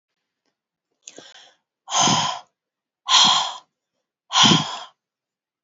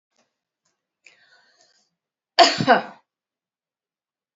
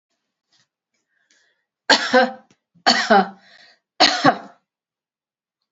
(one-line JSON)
{"exhalation_length": "5.6 s", "exhalation_amplitude": 26628, "exhalation_signal_mean_std_ratio": 0.37, "cough_length": "4.4 s", "cough_amplitude": 30253, "cough_signal_mean_std_ratio": 0.21, "three_cough_length": "5.7 s", "three_cough_amplitude": 29328, "three_cough_signal_mean_std_ratio": 0.32, "survey_phase": "beta (2021-08-13 to 2022-03-07)", "age": "65+", "gender": "Female", "wearing_mask": "No", "symptom_none": true, "smoker_status": "Ex-smoker", "respiratory_condition_asthma": false, "respiratory_condition_other": false, "recruitment_source": "REACT", "submission_delay": "2 days", "covid_test_result": "Negative", "covid_test_method": "RT-qPCR", "influenza_a_test_result": "Negative", "influenza_b_test_result": "Negative"}